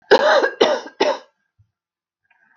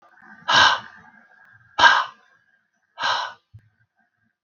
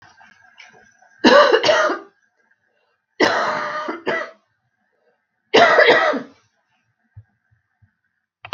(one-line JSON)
{"cough_length": "2.6 s", "cough_amplitude": 32767, "cough_signal_mean_std_ratio": 0.43, "exhalation_length": "4.4 s", "exhalation_amplitude": 32766, "exhalation_signal_mean_std_ratio": 0.33, "three_cough_length": "8.5 s", "three_cough_amplitude": 32768, "three_cough_signal_mean_std_ratio": 0.39, "survey_phase": "beta (2021-08-13 to 2022-03-07)", "age": "45-64", "gender": "Female", "wearing_mask": "No", "symptom_cough_any": true, "symptom_runny_or_blocked_nose": true, "smoker_status": "Never smoked", "respiratory_condition_asthma": true, "respiratory_condition_other": false, "recruitment_source": "REACT", "submission_delay": "2 days", "covid_test_result": "Negative", "covid_test_method": "RT-qPCR", "influenza_a_test_result": "Unknown/Void", "influenza_b_test_result": "Unknown/Void"}